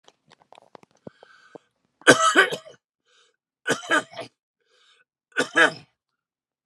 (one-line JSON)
{"three_cough_length": "6.7 s", "three_cough_amplitude": 32500, "three_cough_signal_mean_std_ratio": 0.28, "survey_phase": "beta (2021-08-13 to 2022-03-07)", "age": "65+", "gender": "Male", "wearing_mask": "No", "symptom_runny_or_blocked_nose": true, "symptom_diarrhoea": true, "symptom_fatigue": true, "symptom_onset": "12 days", "smoker_status": "Never smoked", "respiratory_condition_asthma": false, "respiratory_condition_other": false, "recruitment_source": "REACT", "submission_delay": "2 days", "covid_test_result": "Negative", "covid_test_method": "RT-qPCR"}